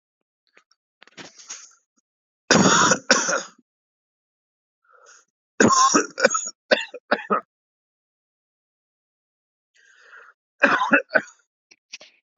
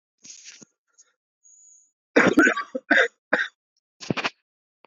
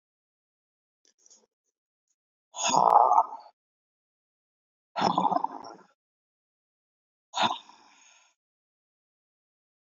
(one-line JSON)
{"three_cough_length": "12.4 s", "three_cough_amplitude": 32767, "three_cough_signal_mean_std_ratio": 0.32, "cough_length": "4.9 s", "cough_amplitude": 23103, "cough_signal_mean_std_ratio": 0.32, "exhalation_length": "9.8 s", "exhalation_amplitude": 17865, "exhalation_signal_mean_std_ratio": 0.27, "survey_phase": "beta (2021-08-13 to 2022-03-07)", "age": "18-44", "gender": "Male", "wearing_mask": "No", "symptom_cough_any": true, "symptom_new_continuous_cough": true, "symptom_runny_or_blocked_nose": true, "symptom_shortness_of_breath": true, "symptom_abdominal_pain": true, "symptom_diarrhoea": true, "symptom_fatigue": true, "symptom_fever_high_temperature": true, "symptom_change_to_sense_of_smell_or_taste": true, "symptom_loss_of_taste": true, "symptom_onset": "3 days", "smoker_status": "Ex-smoker", "respiratory_condition_asthma": false, "respiratory_condition_other": false, "recruitment_source": "Test and Trace", "submission_delay": "1 day", "covid_test_result": "Positive", "covid_test_method": "RT-qPCR", "covid_ct_value": 16.5, "covid_ct_gene": "ORF1ab gene"}